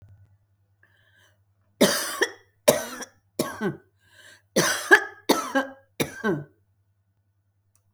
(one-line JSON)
{"three_cough_length": "7.9 s", "three_cough_amplitude": 27295, "three_cough_signal_mean_std_ratio": 0.34, "survey_phase": "alpha (2021-03-01 to 2021-08-12)", "age": "65+", "gender": "Female", "wearing_mask": "No", "symptom_none": true, "smoker_status": "Never smoked", "respiratory_condition_asthma": false, "respiratory_condition_other": false, "recruitment_source": "REACT", "submission_delay": "2 days", "covid_test_result": "Negative", "covid_test_method": "RT-qPCR"}